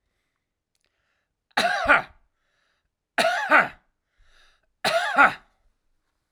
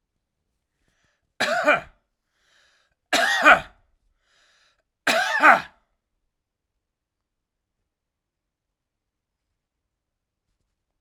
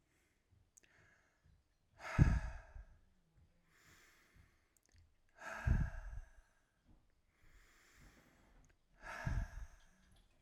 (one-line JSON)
{"three_cough_length": "6.3 s", "three_cough_amplitude": 25163, "three_cough_signal_mean_std_ratio": 0.34, "cough_length": "11.0 s", "cough_amplitude": 32767, "cough_signal_mean_std_ratio": 0.25, "exhalation_length": "10.4 s", "exhalation_amplitude": 5547, "exhalation_signal_mean_std_ratio": 0.28, "survey_phase": "alpha (2021-03-01 to 2021-08-12)", "age": "45-64", "gender": "Male", "wearing_mask": "No", "symptom_none": true, "smoker_status": "Ex-smoker", "respiratory_condition_asthma": false, "respiratory_condition_other": false, "recruitment_source": "REACT", "submission_delay": "2 days", "covid_test_result": "Negative", "covid_test_method": "RT-qPCR"}